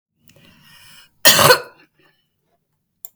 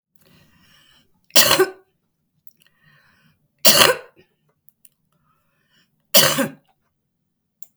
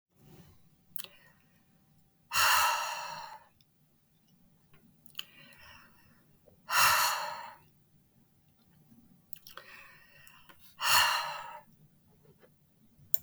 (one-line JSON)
{"cough_length": "3.2 s", "cough_amplitude": 32768, "cough_signal_mean_std_ratio": 0.27, "three_cough_length": "7.8 s", "three_cough_amplitude": 32768, "three_cough_signal_mean_std_ratio": 0.26, "exhalation_length": "13.2 s", "exhalation_amplitude": 27471, "exhalation_signal_mean_std_ratio": 0.34, "survey_phase": "beta (2021-08-13 to 2022-03-07)", "age": "65+", "gender": "Female", "wearing_mask": "No", "symptom_none": true, "smoker_status": "Never smoked", "respiratory_condition_asthma": true, "respiratory_condition_other": false, "recruitment_source": "REACT", "submission_delay": "2 days", "covid_test_result": "Negative", "covid_test_method": "RT-qPCR", "influenza_a_test_result": "Negative", "influenza_b_test_result": "Negative"}